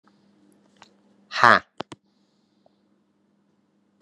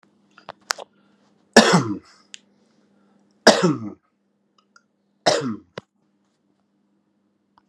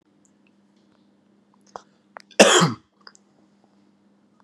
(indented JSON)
{
  "exhalation_length": "4.0 s",
  "exhalation_amplitude": 32627,
  "exhalation_signal_mean_std_ratio": 0.15,
  "three_cough_length": "7.7 s",
  "three_cough_amplitude": 32768,
  "three_cough_signal_mean_std_ratio": 0.25,
  "cough_length": "4.4 s",
  "cough_amplitude": 32767,
  "cough_signal_mean_std_ratio": 0.22,
  "survey_phase": "beta (2021-08-13 to 2022-03-07)",
  "age": "45-64",
  "gender": "Male",
  "wearing_mask": "No",
  "symptom_cough_any": true,
  "symptom_fatigue": true,
  "symptom_headache": true,
  "symptom_onset": "4 days",
  "smoker_status": "Never smoked",
  "respiratory_condition_asthma": false,
  "respiratory_condition_other": false,
  "recruitment_source": "Test and Trace",
  "submission_delay": "1 day",
  "covid_test_result": "Positive",
  "covid_test_method": "RT-qPCR",
  "covid_ct_value": 21.1,
  "covid_ct_gene": "ORF1ab gene"
}